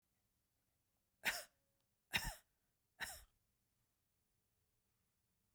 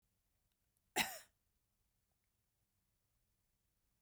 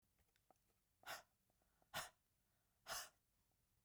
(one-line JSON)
{"three_cough_length": "5.5 s", "three_cough_amplitude": 2642, "three_cough_signal_mean_std_ratio": 0.23, "cough_length": "4.0 s", "cough_amplitude": 2777, "cough_signal_mean_std_ratio": 0.16, "exhalation_length": "3.8 s", "exhalation_amplitude": 518, "exhalation_signal_mean_std_ratio": 0.32, "survey_phase": "beta (2021-08-13 to 2022-03-07)", "age": "45-64", "gender": "Female", "wearing_mask": "No", "symptom_none": true, "smoker_status": "Never smoked", "respiratory_condition_asthma": false, "respiratory_condition_other": false, "recruitment_source": "REACT", "submission_delay": "4 days", "covid_test_result": "Negative", "covid_test_method": "RT-qPCR"}